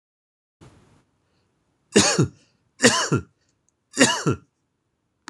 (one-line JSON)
{"three_cough_length": "5.3 s", "three_cough_amplitude": 26027, "three_cough_signal_mean_std_ratio": 0.32, "survey_phase": "beta (2021-08-13 to 2022-03-07)", "age": "45-64", "gender": "Male", "wearing_mask": "No", "symptom_cough_any": true, "symptom_sore_throat": true, "symptom_fatigue": true, "smoker_status": "Never smoked", "respiratory_condition_asthma": false, "respiratory_condition_other": false, "recruitment_source": "Test and Trace", "submission_delay": "2 days", "covid_test_result": "Positive", "covid_test_method": "RT-qPCR", "covid_ct_value": 18.4, "covid_ct_gene": "ORF1ab gene", "covid_ct_mean": 18.9, "covid_viral_load": "610000 copies/ml", "covid_viral_load_category": "Low viral load (10K-1M copies/ml)"}